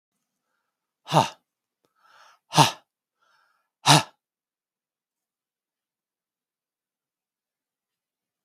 {"exhalation_length": "8.4 s", "exhalation_amplitude": 32767, "exhalation_signal_mean_std_ratio": 0.17, "survey_phase": "beta (2021-08-13 to 2022-03-07)", "age": "65+", "gender": "Male", "wearing_mask": "No", "symptom_runny_or_blocked_nose": true, "symptom_onset": "2 days", "smoker_status": "Never smoked", "respiratory_condition_asthma": false, "respiratory_condition_other": false, "recruitment_source": "Test and Trace", "submission_delay": "1 day", "covid_test_result": "Positive", "covid_test_method": "RT-qPCR", "covid_ct_value": 22.9, "covid_ct_gene": "N gene"}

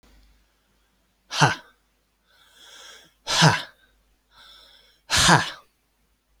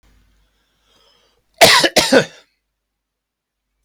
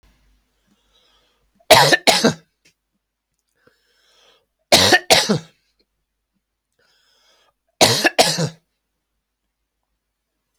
{"exhalation_length": "6.4 s", "exhalation_amplitude": 26461, "exhalation_signal_mean_std_ratio": 0.3, "cough_length": "3.8 s", "cough_amplitude": 32768, "cough_signal_mean_std_ratio": 0.3, "three_cough_length": "10.6 s", "three_cough_amplitude": 32438, "three_cough_signal_mean_std_ratio": 0.29, "survey_phase": "alpha (2021-03-01 to 2021-08-12)", "age": "18-44", "gender": "Male", "wearing_mask": "No", "symptom_none": true, "smoker_status": "Ex-smoker", "respiratory_condition_asthma": true, "respiratory_condition_other": false, "recruitment_source": "REACT", "submission_delay": "1 day", "covid_test_result": "Negative", "covid_test_method": "RT-qPCR"}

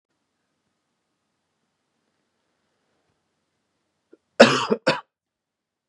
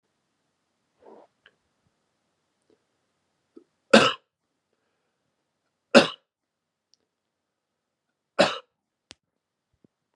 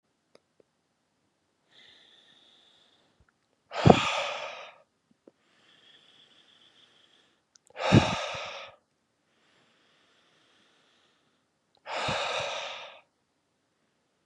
{"cough_length": "5.9 s", "cough_amplitude": 32768, "cough_signal_mean_std_ratio": 0.17, "three_cough_length": "10.2 s", "three_cough_amplitude": 32767, "three_cough_signal_mean_std_ratio": 0.15, "exhalation_length": "14.3 s", "exhalation_amplitude": 32622, "exhalation_signal_mean_std_ratio": 0.24, "survey_phase": "beta (2021-08-13 to 2022-03-07)", "age": "18-44", "gender": "Male", "wearing_mask": "No", "symptom_cough_any": true, "symptom_runny_or_blocked_nose": true, "symptom_shortness_of_breath": true, "symptom_sore_throat": true, "symptom_fatigue": true, "symptom_fever_high_temperature": true, "symptom_headache": true, "smoker_status": "Ex-smoker", "respiratory_condition_asthma": false, "respiratory_condition_other": false, "recruitment_source": "Test and Trace", "submission_delay": "2 days", "covid_test_result": "Positive", "covid_test_method": "RT-qPCR", "covid_ct_value": 14.8, "covid_ct_gene": "ORF1ab gene", "covid_ct_mean": 15.2, "covid_viral_load": "10000000 copies/ml", "covid_viral_load_category": "High viral load (>1M copies/ml)"}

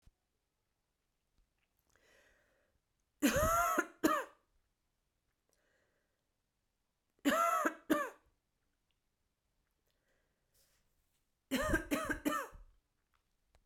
{"three_cough_length": "13.7 s", "three_cough_amplitude": 4548, "three_cough_signal_mean_std_ratio": 0.33, "survey_phase": "beta (2021-08-13 to 2022-03-07)", "age": "18-44", "gender": "Male", "wearing_mask": "No", "symptom_cough_any": true, "symptom_new_continuous_cough": true, "symptom_runny_or_blocked_nose": true, "symptom_shortness_of_breath": true, "symptom_sore_throat": true, "symptom_fatigue": true, "symptom_headache": true, "symptom_change_to_sense_of_smell_or_taste": true, "symptom_loss_of_taste": true, "symptom_onset": "6 days", "smoker_status": "Ex-smoker", "respiratory_condition_asthma": false, "respiratory_condition_other": false, "recruitment_source": "Test and Trace", "submission_delay": "2 days", "covid_test_method": "RT-qPCR"}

